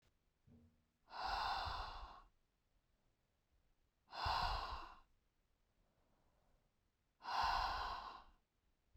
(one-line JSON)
{"exhalation_length": "9.0 s", "exhalation_amplitude": 1308, "exhalation_signal_mean_std_ratio": 0.46, "survey_phase": "beta (2021-08-13 to 2022-03-07)", "age": "18-44", "gender": "Female", "wearing_mask": "No", "symptom_abdominal_pain": true, "smoker_status": "Never smoked", "respiratory_condition_asthma": false, "respiratory_condition_other": false, "recruitment_source": "REACT", "submission_delay": "3 days", "covid_test_result": "Negative", "covid_test_method": "RT-qPCR"}